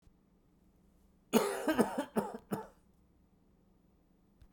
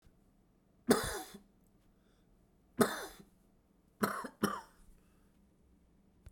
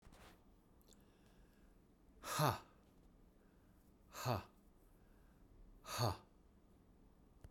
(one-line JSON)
{"cough_length": "4.5 s", "cough_amplitude": 8145, "cough_signal_mean_std_ratio": 0.34, "three_cough_length": "6.3 s", "three_cough_amplitude": 8881, "three_cough_signal_mean_std_ratio": 0.28, "exhalation_length": "7.5 s", "exhalation_amplitude": 2741, "exhalation_signal_mean_std_ratio": 0.34, "survey_phase": "beta (2021-08-13 to 2022-03-07)", "age": "45-64", "gender": "Male", "wearing_mask": "No", "symptom_cough_any": true, "smoker_status": "Never smoked", "respiratory_condition_asthma": false, "respiratory_condition_other": false, "recruitment_source": "REACT", "submission_delay": "2 days", "covid_test_result": "Negative", "covid_test_method": "RT-qPCR"}